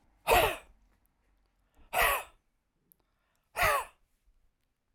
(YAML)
exhalation_length: 4.9 s
exhalation_amplitude: 9699
exhalation_signal_mean_std_ratio: 0.33
survey_phase: alpha (2021-03-01 to 2021-08-12)
age: 65+
gender: Male
wearing_mask: 'No'
symptom_none: true
smoker_status: Ex-smoker
respiratory_condition_asthma: false
respiratory_condition_other: false
recruitment_source: REACT
submission_delay: 5 days
covid_test_result: Negative
covid_test_method: RT-qPCR